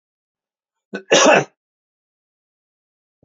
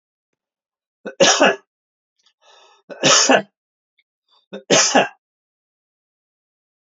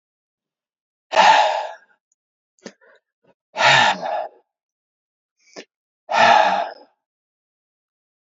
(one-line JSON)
{"cough_length": "3.2 s", "cough_amplitude": 29174, "cough_signal_mean_std_ratio": 0.26, "three_cough_length": "7.0 s", "three_cough_amplitude": 31680, "three_cough_signal_mean_std_ratio": 0.32, "exhalation_length": "8.3 s", "exhalation_amplitude": 27805, "exhalation_signal_mean_std_ratio": 0.35, "survey_phase": "alpha (2021-03-01 to 2021-08-12)", "age": "45-64", "gender": "Male", "wearing_mask": "No", "symptom_none": true, "smoker_status": "Never smoked", "respiratory_condition_asthma": false, "respiratory_condition_other": false, "recruitment_source": "REACT", "submission_delay": "2 days", "covid_test_result": "Negative", "covid_test_method": "RT-qPCR"}